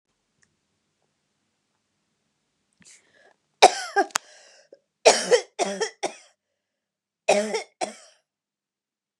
{"cough_length": "9.2 s", "cough_amplitude": 29204, "cough_signal_mean_std_ratio": 0.24, "survey_phase": "beta (2021-08-13 to 2022-03-07)", "age": "45-64", "gender": "Female", "wearing_mask": "No", "symptom_runny_or_blocked_nose": true, "smoker_status": "Never smoked", "respiratory_condition_asthma": false, "respiratory_condition_other": false, "recruitment_source": "Test and Trace", "submission_delay": "2 days", "covid_test_result": "Positive", "covid_test_method": "LFT"}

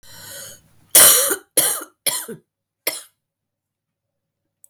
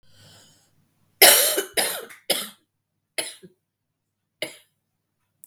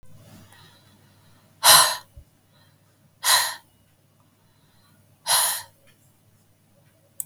{"cough_length": "4.7 s", "cough_amplitude": 32768, "cough_signal_mean_std_ratio": 0.32, "three_cough_length": "5.5 s", "three_cough_amplitude": 32768, "three_cough_signal_mean_std_ratio": 0.27, "exhalation_length": "7.3 s", "exhalation_amplitude": 32577, "exhalation_signal_mean_std_ratio": 0.27, "survey_phase": "beta (2021-08-13 to 2022-03-07)", "age": "45-64", "gender": "Female", "wearing_mask": "No", "symptom_cough_any": true, "symptom_runny_or_blocked_nose": true, "symptom_sore_throat": true, "symptom_fatigue": true, "symptom_headache": true, "symptom_loss_of_taste": true, "smoker_status": "Never smoked", "respiratory_condition_asthma": false, "respiratory_condition_other": false, "recruitment_source": "Test and Trace", "submission_delay": "1 day", "covid_test_result": "Negative", "covid_test_method": "RT-qPCR"}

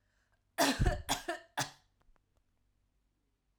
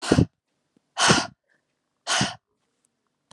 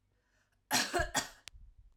{"three_cough_length": "3.6 s", "three_cough_amplitude": 6229, "three_cough_signal_mean_std_ratio": 0.34, "exhalation_length": "3.3 s", "exhalation_amplitude": 24514, "exhalation_signal_mean_std_ratio": 0.34, "cough_length": "2.0 s", "cough_amplitude": 4716, "cough_signal_mean_std_ratio": 0.41, "survey_phase": "alpha (2021-03-01 to 2021-08-12)", "age": "18-44", "gender": "Female", "wearing_mask": "No", "symptom_none": true, "smoker_status": "Never smoked", "respiratory_condition_asthma": false, "respiratory_condition_other": false, "recruitment_source": "REACT", "submission_delay": "1 day", "covid_test_result": "Negative", "covid_test_method": "RT-qPCR"}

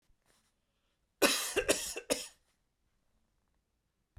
{"cough_length": "4.2 s", "cough_amplitude": 8417, "cough_signal_mean_std_ratio": 0.3, "survey_phase": "beta (2021-08-13 to 2022-03-07)", "age": "45-64", "gender": "Male", "wearing_mask": "No", "symptom_none": true, "symptom_onset": "7 days", "smoker_status": "Never smoked", "respiratory_condition_asthma": false, "respiratory_condition_other": false, "recruitment_source": "REACT", "submission_delay": "3 days", "covid_test_result": "Negative", "covid_test_method": "RT-qPCR"}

